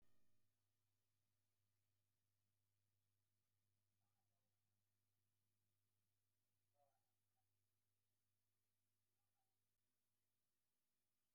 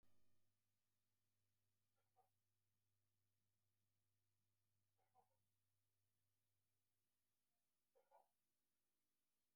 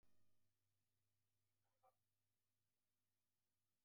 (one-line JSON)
{"exhalation_length": "11.3 s", "exhalation_amplitude": 13, "exhalation_signal_mean_std_ratio": 0.69, "three_cough_length": "9.6 s", "three_cough_amplitude": 25, "three_cough_signal_mean_std_ratio": 0.66, "cough_length": "3.8 s", "cough_amplitude": 18, "cough_signal_mean_std_ratio": 0.67, "survey_phase": "beta (2021-08-13 to 2022-03-07)", "age": "65+", "gender": "Male", "wearing_mask": "No", "symptom_runny_or_blocked_nose": true, "smoker_status": "Ex-smoker", "respiratory_condition_asthma": false, "respiratory_condition_other": false, "recruitment_source": "REACT", "submission_delay": "2 days", "covid_test_result": "Negative", "covid_test_method": "RT-qPCR", "influenza_a_test_result": "Negative", "influenza_b_test_result": "Negative"}